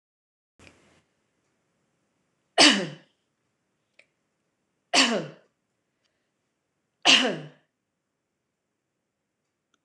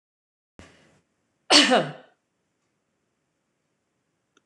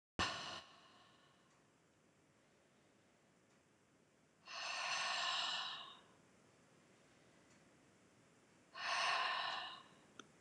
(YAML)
three_cough_length: 9.8 s
three_cough_amplitude: 24234
three_cough_signal_mean_std_ratio: 0.22
cough_length: 4.5 s
cough_amplitude: 25750
cough_signal_mean_std_ratio: 0.22
exhalation_length: 10.4 s
exhalation_amplitude: 2050
exhalation_signal_mean_std_ratio: 0.47
survey_phase: beta (2021-08-13 to 2022-03-07)
age: 65+
gender: Female
wearing_mask: 'No'
symptom_none: true
smoker_status: Never smoked
respiratory_condition_asthma: true
respiratory_condition_other: false
recruitment_source: REACT
submission_delay: 2 days
covid_test_result: Negative
covid_test_method: RT-qPCR
influenza_a_test_result: Negative
influenza_b_test_result: Negative